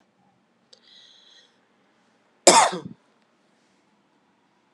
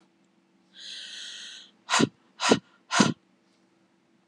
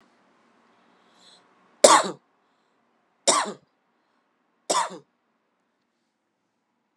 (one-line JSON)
{"cough_length": "4.7 s", "cough_amplitude": 32176, "cough_signal_mean_std_ratio": 0.19, "exhalation_length": "4.3 s", "exhalation_amplitude": 18933, "exhalation_signal_mean_std_ratio": 0.31, "three_cough_length": "7.0 s", "three_cough_amplitude": 32767, "three_cough_signal_mean_std_ratio": 0.21, "survey_phase": "beta (2021-08-13 to 2022-03-07)", "age": "18-44", "gender": "Female", "wearing_mask": "No", "symptom_cough_any": true, "symptom_runny_or_blocked_nose": true, "symptom_change_to_sense_of_smell_or_taste": true, "symptom_loss_of_taste": true, "smoker_status": "Ex-smoker", "respiratory_condition_asthma": false, "respiratory_condition_other": false, "recruitment_source": "Test and Trace", "submission_delay": "2 days", "covid_test_result": "Positive", "covid_test_method": "RT-qPCR", "covid_ct_value": 24.4, "covid_ct_gene": "S gene", "covid_ct_mean": 25.1, "covid_viral_load": "6000 copies/ml", "covid_viral_load_category": "Minimal viral load (< 10K copies/ml)"}